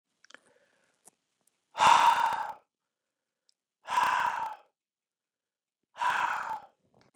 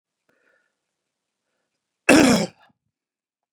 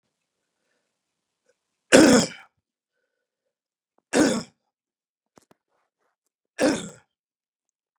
{"exhalation_length": "7.2 s", "exhalation_amplitude": 11527, "exhalation_signal_mean_std_ratio": 0.37, "cough_length": "3.5 s", "cough_amplitude": 31279, "cough_signal_mean_std_ratio": 0.25, "three_cough_length": "8.0 s", "three_cough_amplitude": 32768, "three_cough_signal_mean_std_ratio": 0.23, "survey_phase": "beta (2021-08-13 to 2022-03-07)", "age": "45-64", "gender": "Male", "wearing_mask": "No", "symptom_cough_any": true, "smoker_status": "Never smoked", "respiratory_condition_asthma": false, "respiratory_condition_other": false, "recruitment_source": "REACT", "submission_delay": "2 days", "covid_test_result": "Negative", "covid_test_method": "RT-qPCR", "influenza_a_test_result": "Negative", "influenza_b_test_result": "Negative"}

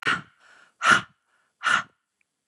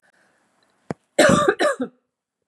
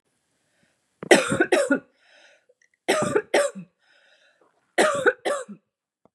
{"exhalation_length": "2.5 s", "exhalation_amplitude": 20988, "exhalation_signal_mean_std_ratio": 0.35, "cough_length": "2.5 s", "cough_amplitude": 27045, "cough_signal_mean_std_ratio": 0.38, "three_cough_length": "6.1 s", "three_cough_amplitude": 29500, "three_cough_signal_mean_std_ratio": 0.39, "survey_phase": "beta (2021-08-13 to 2022-03-07)", "age": "45-64", "gender": "Female", "wearing_mask": "No", "symptom_none": true, "smoker_status": "Never smoked", "respiratory_condition_asthma": false, "respiratory_condition_other": false, "recruitment_source": "REACT", "submission_delay": "1 day", "covid_test_result": "Negative", "covid_test_method": "RT-qPCR", "influenza_a_test_result": "Negative", "influenza_b_test_result": "Negative"}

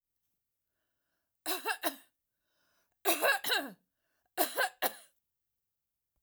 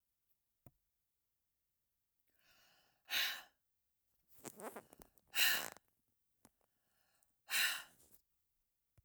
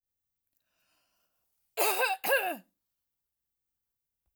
{"three_cough_length": "6.2 s", "three_cough_amplitude": 6175, "three_cough_signal_mean_std_ratio": 0.35, "exhalation_length": "9.0 s", "exhalation_amplitude": 3779, "exhalation_signal_mean_std_ratio": 0.26, "cough_length": "4.4 s", "cough_amplitude": 6100, "cough_signal_mean_std_ratio": 0.32, "survey_phase": "beta (2021-08-13 to 2022-03-07)", "age": "45-64", "gender": "Female", "wearing_mask": "No", "symptom_none": true, "smoker_status": "Never smoked", "respiratory_condition_asthma": false, "respiratory_condition_other": false, "recruitment_source": "REACT", "submission_delay": "6 days", "covid_test_result": "Negative", "covid_test_method": "RT-qPCR"}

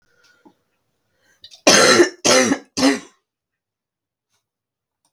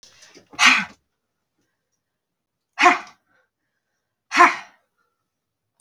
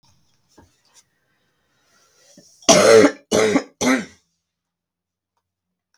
{"cough_length": "5.1 s", "cough_amplitude": 32768, "cough_signal_mean_std_ratio": 0.34, "exhalation_length": "5.8 s", "exhalation_amplitude": 32768, "exhalation_signal_mean_std_ratio": 0.25, "three_cough_length": "6.0 s", "three_cough_amplitude": 32768, "three_cough_signal_mean_std_ratio": 0.31, "survey_phase": "beta (2021-08-13 to 2022-03-07)", "age": "45-64", "gender": "Female", "wearing_mask": "No", "symptom_cough_any": true, "symptom_runny_or_blocked_nose": true, "symptom_sore_throat": true, "symptom_fatigue": true, "symptom_fever_high_temperature": true, "symptom_headache": true, "symptom_change_to_sense_of_smell_or_taste": true, "symptom_loss_of_taste": true, "symptom_other": true, "symptom_onset": "6 days", "smoker_status": "Never smoked", "respiratory_condition_asthma": false, "respiratory_condition_other": false, "recruitment_source": "Test and Trace", "submission_delay": "2 days", "covid_test_result": "Positive", "covid_test_method": "RT-qPCR", "covid_ct_value": 16.5, "covid_ct_gene": "ORF1ab gene", "covid_ct_mean": 16.8, "covid_viral_load": "3100000 copies/ml", "covid_viral_load_category": "High viral load (>1M copies/ml)"}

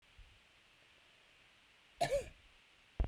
{"cough_length": "3.1 s", "cough_amplitude": 3018, "cough_signal_mean_std_ratio": 0.3, "survey_phase": "beta (2021-08-13 to 2022-03-07)", "age": "45-64", "gender": "Female", "wearing_mask": "No", "symptom_none": true, "symptom_onset": "2 days", "smoker_status": "Never smoked", "respiratory_condition_asthma": false, "respiratory_condition_other": false, "recruitment_source": "REACT", "submission_delay": "2 days", "covid_test_result": "Negative", "covid_test_method": "RT-qPCR"}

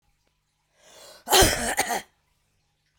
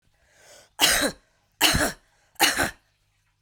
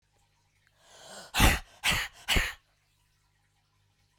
{"cough_length": "3.0 s", "cough_amplitude": 22723, "cough_signal_mean_std_ratio": 0.34, "three_cough_length": "3.4 s", "three_cough_amplitude": 25057, "three_cough_signal_mean_std_ratio": 0.42, "exhalation_length": "4.2 s", "exhalation_amplitude": 14199, "exhalation_signal_mean_std_ratio": 0.32, "survey_phase": "beta (2021-08-13 to 2022-03-07)", "age": "45-64", "gender": "Female", "wearing_mask": "Yes", "symptom_new_continuous_cough": true, "symptom_runny_or_blocked_nose": true, "symptom_headache": true, "symptom_other": true, "symptom_onset": "4 days", "smoker_status": "Never smoked", "respiratory_condition_asthma": true, "respiratory_condition_other": false, "recruitment_source": "Test and Trace", "submission_delay": "2 days", "covid_test_result": "Positive", "covid_test_method": "RT-qPCR", "covid_ct_value": 17.5, "covid_ct_gene": "ORF1ab gene", "covid_ct_mean": 17.9, "covid_viral_load": "1400000 copies/ml", "covid_viral_load_category": "High viral load (>1M copies/ml)"}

